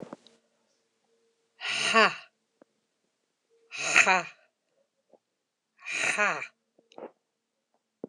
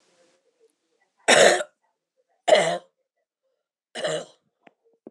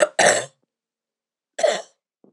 {"exhalation_length": "8.1 s", "exhalation_amplitude": 20919, "exhalation_signal_mean_std_ratio": 0.3, "three_cough_length": "5.1 s", "three_cough_amplitude": 25383, "three_cough_signal_mean_std_ratio": 0.3, "cough_length": "2.3 s", "cough_amplitude": 25751, "cough_signal_mean_std_ratio": 0.36, "survey_phase": "alpha (2021-03-01 to 2021-08-12)", "age": "45-64", "gender": "Female", "wearing_mask": "No", "symptom_fatigue": true, "symptom_headache": true, "symptom_change_to_sense_of_smell_or_taste": true, "symptom_loss_of_taste": true, "symptom_onset": "3 days", "smoker_status": "Ex-smoker", "respiratory_condition_asthma": false, "respiratory_condition_other": false, "recruitment_source": "Test and Trace", "submission_delay": "2 days", "covid_test_result": "Positive", "covid_test_method": "RT-qPCR", "covid_ct_value": 20.4, "covid_ct_gene": "N gene", "covid_ct_mean": 20.7, "covid_viral_load": "170000 copies/ml", "covid_viral_load_category": "Low viral load (10K-1M copies/ml)"}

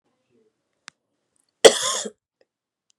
{"cough_length": "3.0 s", "cough_amplitude": 32768, "cough_signal_mean_std_ratio": 0.18, "survey_phase": "beta (2021-08-13 to 2022-03-07)", "age": "45-64", "gender": "Female", "wearing_mask": "No", "symptom_cough_any": true, "symptom_runny_or_blocked_nose": true, "symptom_fatigue": true, "symptom_headache": true, "symptom_onset": "3 days", "smoker_status": "Never smoked", "respiratory_condition_asthma": false, "respiratory_condition_other": false, "recruitment_source": "Test and Trace", "submission_delay": "2 days", "covid_test_result": "Positive", "covid_test_method": "RT-qPCR", "covid_ct_value": 16.0, "covid_ct_gene": "ORF1ab gene", "covid_ct_mean": 16.9, "covid_viral_load": "2900000 copies/ml", "covid_viral_load_category": "High viral load (>1M copies/ml)"}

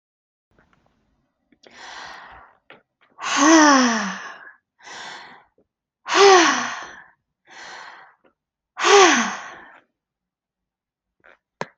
{"exhalation_length": "11.8 s", "exhalation_amplitude": 31315, "exhalation_signal_mean_std_ratio": 0.34, "survey_phase": "alpha (2021-03-01 to 2021-08-12)", "age": "45-64", "gender": "Female", "wearing_mask": "Yes", "symptom_fatigue": true, "symptom_headache": true, "symptom_onset": "5 days", "smoker_status": "Never smoked", "respiratory_condition_asthma": true, "respiratory_condition_other": false, "recruitment_source": "REACT", "submission_delay": "2 days", "covid_test_result": "Negative", "covid_test_method": "RT-qPCR"}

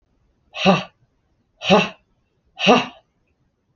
{"exhalation_length": "3.8 s", "exhalation_amplitude": 27785, "exhalation_signal_mean_std_ratio": 0.33, "survey_phase": "beta (2021-08-13 to 2022-03-07)", "age": "18-44", "gender": "Female", "wearing_mask": "No", "symptom_none": true, "symptom_onset": "4 days", "smoker_status": "Ex-smoker", "respiratory_condition_asthma": false, "respiratory_condition_other": false, "recruitment_source": "REACT", "submission_delay": "11 days", "covid_test_result": "Negative", "covid_test_method": "RT-qPCR"}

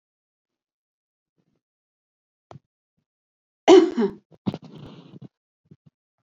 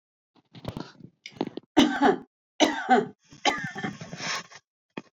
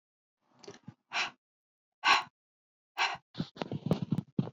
{"cough_length": "6.2 s", "cough_amplitude": 29093, "cough_signal_mean_std_ratio": 0.19, "three_cough_length": "5.1 s", "three_cough_amplitude": 15982, "three_cough_signal_mean_std_ratio": 0.4, "exhalation_length": "4.5 s", "exhalation_amplitude": 8671, "exhalation_signal_mean_std_ratio": 0.35, "survey_phase": "beta (2021-08-13 to 2022-03-07)", "age": "45-64", "gender": "Female", "wearing_mask": "No", "symptom_runny_or_blocked_nose": true, "smoker_status": "Ex-smoker", "respiratory_condition_asthma": false, "respiratory_condition_other": false, "recruitment_source": "REACT", "submission_delay": "2 days", "covid_test_result": "Negative", "covid_test_method": "RT-qPCR"}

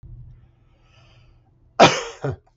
{"cough_length": "2.6 s", "cough_amplitude": 32767, "cough_signal_mean_std_ratio": 0.26, "survey_phase": "beta (2021-08-13 to 2022-03-07)", "age": "65+", "gender": "Male", "wearing_mask": "No", "symptom_none": true, "smoker_status": "Never smoked", "respiratory_condition_asthma": false, "respiratory_condition_other": false, "recruitment_source": "REACT", "submission_delay": "1 day", "covid_test_result": "Negative", "covid_test_method": "RT-qPCR", "influenza_a_test_result": "Negative", "influenza_b_test_result": "Negative"}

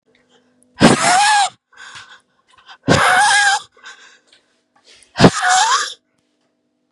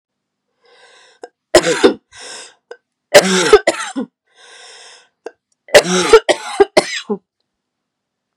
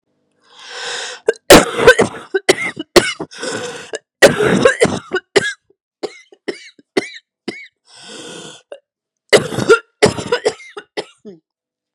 {"exhalation_length": "6.9 s", "exhalation_amplitude": 32768, "exhalation_signal_mean_std_ratio": 0.47, "three_cough_length": "8.4 s", "three_cough_amplitude": 32768, "three_cough_signal_mean_std_ratio": 0.34, "cough_length": "11.9 s", "cough_amplitude": 32768, "cough_signal_mean_std_ratio": 0.37, "survey_phase": "beta (2021-08-13 to 2022-03-07)", "age": "18-44", "gender": "Female", "wearing_mask": "No", "symptom_cough_any": true, "symptom_runny_or_blocked_nose": true, "symptom_sore_throat": true, "symptom_fatigue": true, "symptom_headache": true, "symptom_onset": "4 days", "smoker_status": "Ex-smoker", "respiratory_condition_asthma": true, "respiratory_condition_other": false, "recruitment_source": "Test and Trace", "submission_delay": "1 day", "covid_test_result": "Positive", "covid_test_method": "RT-qPCR", "covid_ct_value": 17.9, "covid_ct_gene": "N gene"}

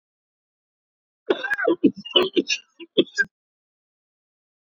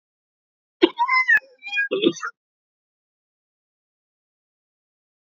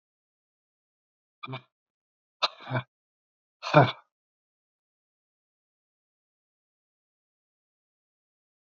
{"three_cough_length": "4.7 s", "three_cough_amplitude": 24016, "three_cough_signal_mean_std_ratio": 0.32, "cough_length": "5.3 s", "cough_amplitude": 30907, "cough_signal_mean_std_ratio": 0.31, "exhalation_length": "8.7 s", "exhalation_amplitude": 27413, "exhalation_signal_mean_std_ratio": 0.15, "survey_phase": "beta (2021-08-13 to 2022-03-07)", "age": "65+", "gender": "Male", "wearing_mask": "No", "symptom_cough_any": true, "symptom_runny_or_blocked_nose": true, "symptom_shortness_of_breath": true, "symptom_fatigue": true, "symptom_headache": true, "symptom_onset": "13 days", "smoker_status": "Never smoked", "respiratory_condition_asthma": false, "respiratory_condition_other": false, "recruitment_source": "Test and Trace", "submission_delay": "0 days", "covid_test_result": "Positive", "covid_test_method": "RT-qPCR", "covid_ct_value": 24.8, "covid_ct_gene": "ORF1ab gene"}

